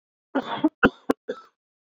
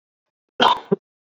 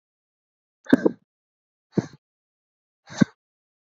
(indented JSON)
{
  "three_cough_length": "1.9 s",
  "three_cough_amplitude": 23708,
  "three_cough_signal_mean_std_ratio": 0.31,
  "cough_length": "1.4 s",
  "cough_amplitude": 29878,
  "cough_signal_mean_std_ratio": 0.31,
  "exhalation_length": "3.8 s",
  "exhalation_amplitude": 31734,
  "exhalation_signal_mean_std_ratio": 0.16,
  "survey_phase": "beta (2021-08-13 to 2022-03-07)",
  "age": "18-44",
  "gender": "Male",
  "wearing_mask": "No",
  "symptom_new_continuous_cough": true,
  "symptom_runny_or_blocked_nose": true,
  "symptom_shortness_of_breath": true,
  "symptom_diarrhoea": true,
  "symptom_fatigue": true,
  "symptom_fever_high_temperature": true,
  "symptom_headache": true,
  "symptom_onset": "3 days",
  "smoker_status": "Never smoked",
  "respiratory_condition_asthma": true,
  "respiratory_condition_other": false,
  "recruitment_source": "Test and Trace",
  "submission_delay": "1 day",
  "covid_test_result": "Positive",
  "covid_test_method": "ePCR"
}